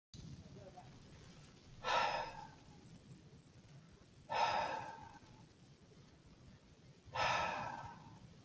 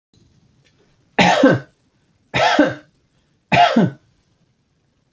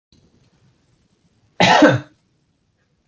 {"exhalation_length": "8.4 s", "exhalation_amplitude": 2094, "exhalation_signal_mean_std_ratio": 0.5, "three_cough_length": "5.1 s", "three_cough_amplitude": 30029, "three_cough_signal_mean_std_ratio": 0.39, "cough_length": "3.1 s", "cough_amplitude": 27370, "cough_signal_mean_std_ratio": 0.29, "survey_phase": "beta (2021-08-13 to 2022-03-07)", "age": "18-44", "gender": "Male", "wearing_mask": "No", "symptom_none": true, "smoker_status": "Never smoked", "respiratory_condition_asthma": false, "respiratory_condition_other": false, "recruitment_source": "REACT", "submission_delay": "2 days", "covid_test_result": "Negative", "covid_test_method": "RT-qPCR", "influenza_a_test_result": "Negative", "influenza_b_test_result": "Negative"}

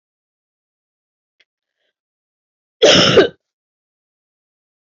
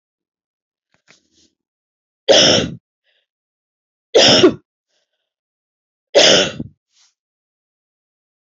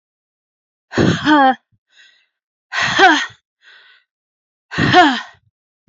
{"cough_length": "4.9 s", "cough_amplitude": 31400, "cough_signal_mean_std_ratio": 0.25, "three_cough_length": "8.4 s", "three_cough_amplitude": 32767, "three_cough_signal_mean_std_ratio": 0.3, "exhalation_length": "5.9 s", "exhalation_amplitude": 28677, "exhalation_signal_mean_std_ratio": 0.41, "survey_phase": "beta (2021-08-13 to 2022-03-07)", "age": "45-64", "gender": "Female", "wearing_mask": "No", "symptom_new_continuous_cough": true, "symptom_runny_or_blocked_nose": true, "symptom_fatigue": true, "symptom_other": true, "symptom_onset": "5 days", "smoker_status": "Never smoked", "respiratory_condition_asthma": false, "respiratory_condition_other": false, "recruitment_source": "Test and Trace", "submission_delay": "2 days", "covid_test_result": "Positive", "covid_test_method": "RT-qPCR"}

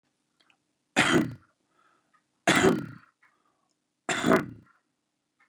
{"three_cough_length": "5.5 s", "three_cough_amplitude": 16881, "three_cough_signal_mean_std_ratio": 0.33, "survey_phase": "beta (2021-08-13 to 2022-03-07)", "age": "45-64", "gender": "Male", "wearing_mask": "No", "symptom_none": true, "smoker_status": "Ex-smoker", "respiratory_condition_asthma": false, "respiratory_condition_other": false, "recruitment_source": "REACT", "submission_delay": "2 days", "covid_test_result": "Negative", "covid_test_method": "RT-qPCR", "influenza_a_test_result": "Negative", "influenza_b_test_result": "Negative"}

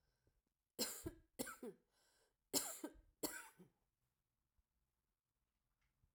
{"cough_length": "6.1 s", "cough_amplitude": 2218, "cough_signal_mean_std_ratio": 0.3, "survey_phase": "alpha (2021-03-01 to 2021-08-12)", "age": "65+", "gender": "Female", "wearing_mask": "No", "symptom_fatigue": true, "symptom_headache": true, "symptom_change_to_sense_of_smell_or_taste": true, "symptom_loss_of_taste": true, "symptom_onset": "3 days", "smoker_status": "Ex-smoker", "respiratory_condition_asthma": false, "respiratory_condition_other": false, "recruitment_source": "Test and Trace", "submission_delay": "2 days", "covid_test_result": "Positive", "covid_test_method": "RT-qPCR", "covid_ct_value": 19.1, "covid_ct_gene": "ORF1ab gene", "covid_ct_mean": 19.5, "covid_viral_load": "400000 copies/ml", "covid_viral_load_category": "Low viral load (10K-1M copies/ml)"}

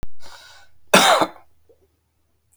{"cough_length": "2.6 s", "cough_amplitude": 32768, "cough_signal_mean_std_ratio": 0.41, "survey_phase": "beta (2021-08-13 to 2022-03-07)", "age": "45-64", "gender": "Male", "wearing_mask": "No", "symptom_cough_any": true, "symptom_runny_or_blocked_nose": true, "symptom_fatigue": true, "symptom_fever_high_temperature": true, "symptom_headache": true, "smoker_status": "Never smoked", "respiratory_condition_asthma": false, "respiratory_condition_other": false, "recruitment_source": "Test and Trace", "submission_delay": "2 days", "covid_test_result": "Positive", "covid_test_method": "LFT"}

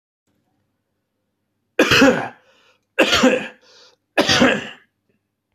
{"three_cough_length": "5.5 s", "three_cough_amplitude": 26154, "three_cough_signal_mean_std_ratio": 0.39, "survey_phase": "beta (2021-08-13 to 2022-03-07)", "age": "45-64", "gender": "Male", "wearing_mask": "No", "symptom_cough_any": true, "symptom_runny_or_blocked_nose": true, "symptom_sore_throat": true, "symptom_abdominal_pain": true, "symptom_diarrhoea": true, "symptom_fatigue": true, "symptom_headache": true, "symptom_onset": "2 days", "smoker_status": "Ex-smoker", "respiratory_condition_asthma": false, "respiratory_condition_other": false, "recruitment_source": "Test and Trace", "submission_delay": "2 days", "covid_test_result": "Positive", "covid_test_method": "RT-qPCR", "covid_ct_value": 24.4, "covid_ct_gene": "N gene", "covid_ct_mean": 25.2, "covid_viral_load": "5400 copies/ml", "covid_viral_load_category": "Minimal viral load (< 10K copies/ml)"}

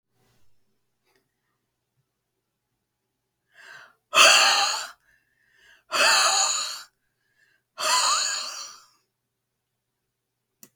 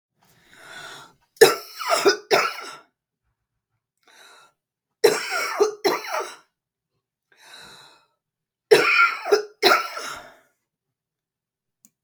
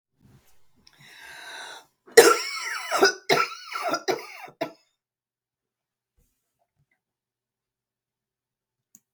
{"exhalation_length": "10.8 s", "exhalation_amplitude": 28937, "exhalation_signal_mean_std_ratio": 0.35, "three_cough_length": "12.0 s", "three_cough_amplitude": 32768, "three_cough_signal_mean_std_ratio": 0.35, "cough_length": "9.1 s", "cough_amplitude": 32768, "cough_signal_mean_std_ratio": 0.26, "survey_phase": "beta (2021-08-13 to 2022-03-07)", "age": "65+", "gender": "Female", "wearing_mask": "No", "symptom_cough_any": true, "symptom_runny_or_blocked_nose": true, "smoker_status": "Never smoked", "respiratory_condition_asthma": true, "respiratory_condition_other": false, "recruitment_source": "REACT", "submission_delay": "2 days", "covid_test_result": "Negative", "covid_test_method": "RT-qPCR", "influenza_a_test_result": "Negative", "influenza_b_test_result": "Negative"}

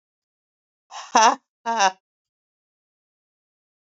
{"exhalation_length": "3.8 s", "exhalation_amplitude": 26667, "exhalation_signal_mean_std_ratio": 0.25, "survey_phase": "beta (2021-08-13 to 2022-03-07)", "age": "45-64", "gender": "Female", "wearing_mask": "No", "symptom_cough_any": true, "symptom_new_continuous_cough": true, "symptom_runny_or_blocked_nose": true, "symptom_shortness_of_breath": true, "symptom_sore_throat": true, "symptom_fatigue": true, "symptom_fever_high_temperature": true, "symptom_headache": true, "symptom_change_to_sense_of_smell_or_taste": true, "symptom_loss_of_taste": true, "symptom_onset": "2 days", "smoker_status": "Current smoker (e-cigarettes or vapes only)", "respiratory_condition_asthma": false, "respiratory_condition_other": true, "recruitment_source": "Test and Trace", "submission_delay": "1 day", "covid_test_result": "Positive", "covid_test_method": "RT-qPCR", "covid_ct_value": 22.0, "covid_ct_gene": "ORF1ab gene"}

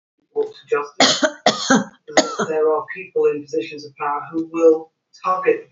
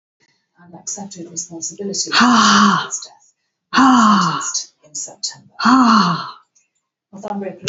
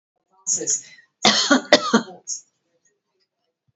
{"three_cough_length": "5.7 s", "three_cough_amplitude": 32218, "three_cough_signal_mean_std_ratio": 0.6, "exhalation_length": "7.7 s", "exhalation_amplitude": 32078, "exhalation_signal_mean_std_ratio": 0.54, "cough_length": "3.8 s", "cough_amplitude": 31344, "cough_signal_mean_std_ratio": 0.37, "survey_phase": "alpha (2021-03-01 to 2021-08-12)", "age": "65+", "gender": "Female", "wearing_mask": "No", "symptom_fatigue": true, "symptom_onset": "11 days", "smoker_status": "Never smoked", "respiratory_condition_asthma": false, "respiratory_condition_other": false, "recruitment_source": "REACT", "submission_delay": "32 days", "covid_test_result": "Negative", "covid_test_method": "RT-qPCR"}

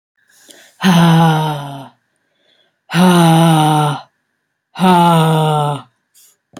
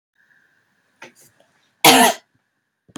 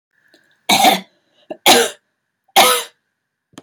{"exhalation_length": "6.6 s", "exhalation_amplitude": 31335, "exhalation_signal_mean_std_ratio": 0.62, "cough_length": "3.0 s", "cough_amplitude": 32768, "cough_signal_mean_std_ratio": 0.26, "three_cough_length": "3.6 s", "three_cough_amplitude": 32768, "three_cough_signal_mean_std_ratio": 0.39, "survey_phase": "beta (2021-08-13 to 2022-03-07)", "age": "18-44", "gender": "Female", "wearing_mask": "No", "symptom_runny_or_blocked_nose": true, "symptom_shortness_of_breath": true, "symptom_sore_throat": true, "symptom_fatigue": true, "symptom_headache": true, "smoker_status": "Ex-smoker", "respiratory_condition_asthma": false, "respiratory_condition_other": false, "recruitment_source": "REACT", "submission_delay": "1 day", "covid_test_result": "Negative", "covid_test_method": "RT-qPCR", "covid_ct_value": 38.0, "covid_ct_gene": "N gene", "influenza_a_test_result": "Negative", "influenza_b_test_result": "Negative"}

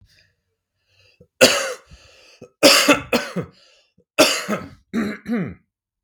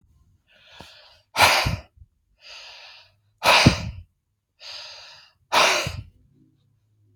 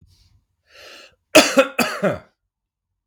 {"three_cough_length": "6.0 s", "three_cough_amplitude": 32768, "three_cough_signal_mean_std_ratio": 0.38, "exhalation_length": "7.2 s", "exhalation_amplitude": 29107, "exhalation_signal_mean_std_ratio": 0.34, "cough_length": "3.1 s", "cough_amplitude": 32768, "cough_signal_mean_std_ratio": 0.31, "survey_phase": "beta (2021-08-13 to 2022-03-07)", "age": "18-44", "gender": "Male", "wearing_mask": "No", "symptom_none": true, "smoker_status": "Ex-smoker", "respiratory_condition_asthma": false, "respiratory_condition_other": false, "recruitment_source": "REACT", "submission_delay": "0 days", "covid_test_result": "Negative", "covid_test_method": "RT-qPCR", "influenza_a_test_result": "Negative", "influenza_b_test_result": "Negative"}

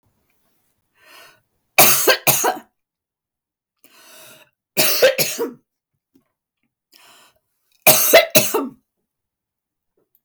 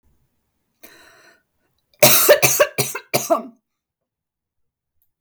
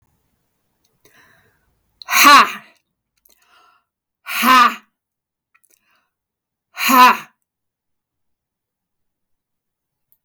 {"three_cough_length": "10.2 s", "three_cough_amplitude": 32768, "three_cough_signal_mean_std_ratio": 0.34, "cough_length": "5.2 s", "cough_amplitude": 32768, "cough_signal_mean_std_ratio": 0.33, "exhalation_length": "10.2 s", "exhalation_amplitude": 32768, "exhalation_signal_mean_std_ratio": 0.27, "survey_phase": "beta (2021-08-13 to 2022-03-07)", "age": "45-64", "gender": "Female", "wearing_mask": "No", "symptom_none": true, "smoker_status": "Never smoked", "respiratory_condition_asthma": true, "respiratory_condition_other": false, "recruitment_source": "REACT", "submission_delay": "1 day", "covid_test_result": "Negative", "covid_test_method": "RT-qPCR", "influenza_a_test_result": "Unknown/Void", "influenza_b_test_result": "Unknown/Void"}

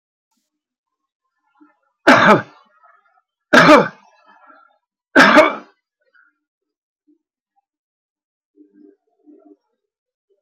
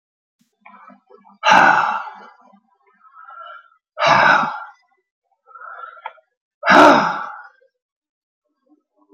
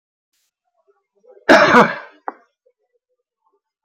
{"three_cough_length": "10.4 s", "three_cough_amplitude": 32767, "three_cough_signal_mean_std_ratio": 0.26, "exhalation_length": "9.1 s", "exhalation_amplitude": 30420, "exhalation_signal_mean_std_ratio": 0.35, "cough_length": "3.8 s", "cough_amplitude": 31282, "cough_signal_mean_std_ratio": 0.28, "survey_phase": "beta (2021-08-13 to 2022-03-07)", "age": "65+", "gender": "Male", "wearing_mask": "No", "symptom_none": true, "smoker_status": "Ex-smoker", "respiratory_condition_asthma": false, "respiratory_condition_other": false, "recruitment_source": "REACT", "submission_delay": "6 days", "covid_test_result": "Negative", "covid_test_method": "RT-qPCR"}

